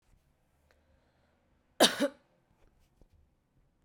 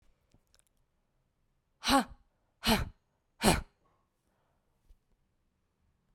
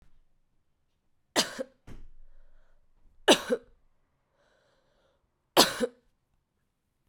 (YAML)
cough_length: 3.8 s
cough_amplitude: 14454
cough_signal_mean_std_ratio: 0.18
exhalation_length: 6.1 s
exhalation_amplitude: 10773
exhalation_signal_mean_std_ratio: 0.24
three_cough_length: 7.1 s
three_cough_amplitude: 25144
three_cough_signal_mean_std_ratio: 0.23
survey_phase: beta (2021-08-13 to 2022-03-07)
age: 18-44
gender: Female
wearing_mask: 'No'
symptom_runny_or_blocked_nose: true
symptom_shortness_of_breath: true
symptom_sore_throat: true
symptom_fatigue: true
symptom_headache: true
symptom_change_to_sense_of_smell_or_taste: true
symptom_onset: 3 days
smoker_status: Never smoked
respiratory_condition_asthma: false
respiratory_condition_other: false
recruitment_source: Test and Trace
submission_delay: 1 day
covid_test_result: Positive
covid_test_method: RT-qPCR